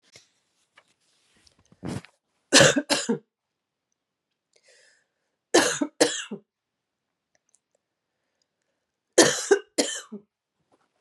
{"three_cough_length": "11.0 s", "three_cough_amplitude": 30504, "three_cough_signal_mean_std_ratio": 0.26, "survey_phase": "beta (2021-08-13 to 2022-03-07)", "age": "45-64", "gender": "Female", "wearing_mask": "No", "symptom_cough_any": true, "symptom_runny_or_blocked_nose": true, "symptom_shortness_of_breath": true, "symptom_sore_throat": true, "symptom_fatigue": true, "symptom_headache": true, "symptom_loss_of_taste": true, "symptom_onset": "4 days", "smoker_status": "Never smoked", "respiratory_condition_asthma": true, "respiratory_condition_other": false, "recruitment_source": "Test and Trace", "submission_delay": "1 day", "covid_test_result": "Positive", "covid_test_method": "ePCR"}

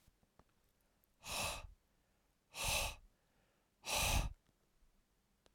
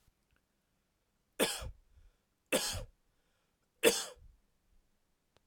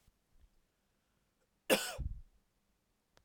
{"exhalation_length": "5.5 s", "exhalation_amplitude": 2186, "exhalation_signal_mean_std_ratio": 0.39, "three_cough_length": "5.5 s", "three_cough_amplitude": 8673, "three_cough_signal_mean_std_ratio": 0.27, "cough_length": "3.2 s", "cough_amplitude": 6305, "cough_signal_mean_std_ratio": 0.25, "survey_phase": "alpha (2021-03-01 to 2021-08-12)", "age": "45-64", "gender": "Male", "wearing_mask": "No", "symptom_none": true, "smoker_status": "Never smoked", "respiratory_condition_asthma": false, "respiratory_condition_other": false, "recruitment_source": "REACT", "submission_delay": "2 days", "covid_test_result": "Negative", "covid_test_method": "RT-qPCR"}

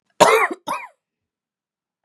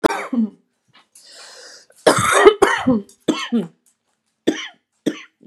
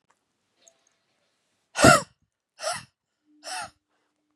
{"cough_length": "2.0 s", "cough_amplitude": 32768, "cough_signal_mean_std_ratio": 0.33, "three_cough_length": "5.5 s", "three_cough_amplitude": 32768, "three_cough_signal_mean_std_ratio": 0.41, "exhalation_length": "4.4 s", "exhalation_amplitude": 29922, "exhalation_signal_mean_std_ratio": 0.21, "survey_phase": "beta (2021-08-13 to 2022-03-07)", "age": "18-44", "gender": "Female", "wearing_mask": "No", "symptom_cough_any": true, "symptom_onset": "13 days", "smoker_status": "Never smoked", "respiratory_condition_asthma": false, "respiratory_condition_other": false, "recruitment_source": "REACT", "submission_delay": "1 day", "covid_test_result": "Negative", "covid_test_method": "RT-qPCR", "influenza_a_test_result": "Negative", "influenza_b_test_result": "Negative"}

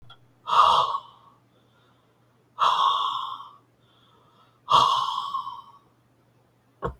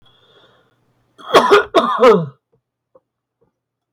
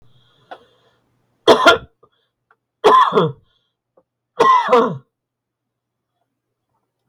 {"exhalation_length": "7.0 s", "exhalation_amplitude": 18397, "exhalation_signal_mean_std_ratio": 0.43, "cough_length": "3.9 s", "cough_amplitude": 32768, "cough_signal_mean_std_ratio": 0.36, "three_cough_length": "7.1 s", "three_cough_amplitude": 32768, "three_cough_signal_mean_std_ratio": 0.34, "survey_phase": "beta (2021-08-13 to 2022-03-07)", "age": "65+", "gender": "Male", "wearing_mask": "No", "symptom_cough_any": true, "symptom_fatigue": true, "symptom_headache": true, "smoker_status": "Ex-smoker", "respiratory_condition_asthma": false, "respiratory_condition_other": false, "recruitment_source": "REACT", "submission_delay": "3 days", "covid_test_result": "Negative", "covid_test_method": "RT-qPCR", "influenza_a_test_result": "Negative", "influenza_b_test_result": "Negative"}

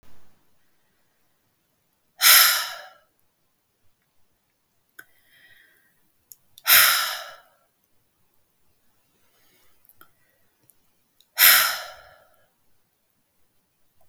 {"exhalation_length": "14.1 s", "exhalation_amplitude": 32565, "exhalation_signal_mean_std_ratio": 0.24, "survey_phase": "beta (2021-08-13 to 2022-03-07)", "age": "45-64", "gender": "Female", "wearing_mask": "No", "symptom_none": true, "smoker_status": "Never smoked", "respiratory_condition_asthma": false, "respiratory_condition_other": false, "recruitment_source": "REACT", "submission_delay": "3 days", "covid_test_result": "Negative", "covid_test_method": "RT-qPCR", "influenza_a_test_result": "Negative", "influenza_b_test_result": "Negative"}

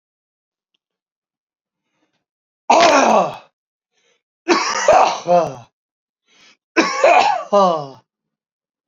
{"three_cough_length": "8.9 s", "three_cough_amplitude": 32768, "three_cough_signal_mean_std_ratio": 0.42, "survey_phase": "alpha (2021-03-01 to 2021-08-12)", "age": "45-64", "gender": "Male", "wearing_mask": "No", "symptom_abdominal_pain": true, "symptom_fatigue": true, "smoker_status": "Never smoked", "respiratory_condition_asthma": false, "respiratory_condition_other": true, "recruitment_source": "Test and Trace", "submission_delay": "2 days", "covid_test_result": "Positive", "covid_test_method": "RT-qPCR", "covid_ct_value": 31.6, "covid_ct_gene": "N gene", "covid_ct_mean": 32.4, "covid_viral_load": "24 copies/ml", "covid_viral_load_category": "Minimal viral load (< 10K copies/ml)"}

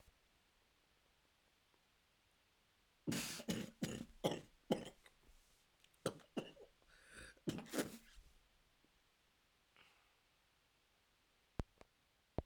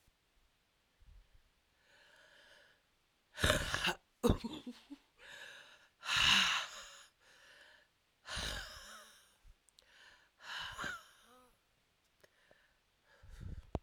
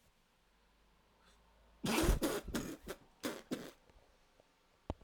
{"three_cough_length": "12.5 s", "three_cough_amplitude": 2830, "three_cough_signal_mean_std_ratio": 0.31, "exhalation_length": "13.8 s", "exhalation_amplitude": 7217, "exhalation_signal_mean_std_ratio": 0.33, "cough_length": "5.0 s", "cough_amplitude": 3772, "cough_signal_mean_std_ratio": 0.39, "survey_phase": "alpha (2021-03-01 to 2021-08-12)", "age": "18-44", "gender": "Female", "wearing_mask": "No", "symptom_cough_any": true, "symptom_shortness_of_breath": true, "symptom_fever_high_temperature": true, "symptom_headache": true, "symptom_change_to_sense_of_smell_or_taste": true, "symptom_loss_of_taste": true, "symptom_onset": "4 days", "smoker_status": "Current smoker (e-cigarettes or vapes only)", "respiratory_condition_asthma": false, "respiratory_condition_other": false, "recruitment_source": "Test and Trace", "submission_delay": "2 days", "covid_test_result": "Positive", "covid_test_method": "RT-qPCR", "covid_ct_value": 15.8, "covid_ct_gene": "ORF1ab gene", "covid_ct_mean": 16.3, "covid_viral_load": "4600000 copies/ml", "covid_viral_load_category": "High viral load (>1M copies/ml)"}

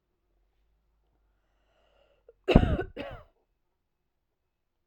{"cough_length": "4.9 s", "cough_amplitude": 29316, "cough_signal_mean_std_ratio": 0.19, "survey_phase": "alpha (2021-03-01 to 2021-08-12)", "age": "18-44", "gender": "Female", "wearing_mask": "No", "symptom_none": true, "smoker_status": "Ex-smoker", "respiratory_condition_asthma": false, "respiratory_condition_other": false, "recruitment_source": "REACT", "submission_delay": "1 day", "covid_test_result": "Negative", "covid_test_method": "RT-qPCR"}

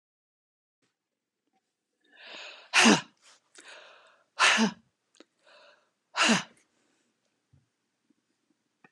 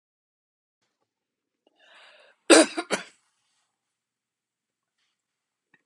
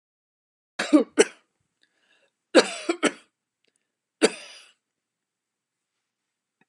{"exhalation_length": "8.9 s", "exhalation_amplitude": 14457, "exhalation_signal_mean_std_ratio": 0.25, "cough_length": "5.9 s", "cough_amplitude": 31633, "cough_signal_mean_std_ratio": 0.16, "three_cough_length": "6.7 s", "three_cough_amplitude": 30054, "three_cough_signal_mean_std_ratio": 0.22, "survey_phase": "beta (2021-08-13 to 2022-03-07)", "age": "65+", "gender": "Female", "wearing_mask": "No", "symptom_none": true, "smoker_status": "Never smoked", "respiratory_condition_asthma": false, "respiratory_condition_other": false, "recruitment_source": "Test and Trace", "submission_delay": "1 day", "covid_test_result": "Negative", "covid_test_method": "RT-qPCR"}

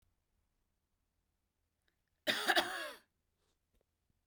{"cough_length": "4.3 s", "cough_amplitude": 4759, "cough_signal_mean_std_ratio": 0.26, "survey_phase": "beta (2021-08-13 to 2022-03-07)", "age": "65+", "gender": "Female", "wearing_mask": "No", "symptom_runny_or_blocked_nose": true, "smoker_status": "Never smoked", "respiratory_condition_asthma": false, "respiratory_condition_other": false, "recruitment_source": "REACT", "submission_delay": "1 day", "covid_test_result": "Negative", "covid_test_method": "RT-qPCR", "influenza_a_test_result": "Negative", "influenza_b_test_result": "Negative"}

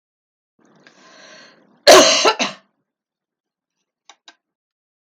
{"cough_length": "5.0 s", "cough_amplitude": 32768, "cough_signal_mean_std_ratio": 0.25, "survey_phase": "beta (2021-08-13 to 2022-03-07)", "age": "65+", "gender": "Female", "wearing_mask": "No", "symptom_none": true, "smoker_status": "Never smoked", "respiratory_condition_asthma": false, "respiratory_condition_other": false, "recruitment_source": "REACT", "submission_delay": "0 days", "covid_test_result": "Negative", "covid_test_method": "RT-qPCR"}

